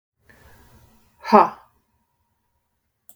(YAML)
exhalation_length: 3.2 s
exhalation_amplitude: 32766
exhalation_signal_mean_std_ratio: 0.19
survey_phase: beta (2021-08-13 to 2022-03-07)
age: 45-64
gender: Female
wearing_mask: 'No'
symptom_headache: true
symptom_onset: 5 days
smoker_status: Ex-smoker
respiratory_condition_asthma: false
respiratory_condition_other: false
recruitment_source: REACT
submission_delay: 2 days
covid_test_result: Negative
covid_test_method: RT-qPCR
influenza_a_test_result: Negative
influenza_b_test_result: Negative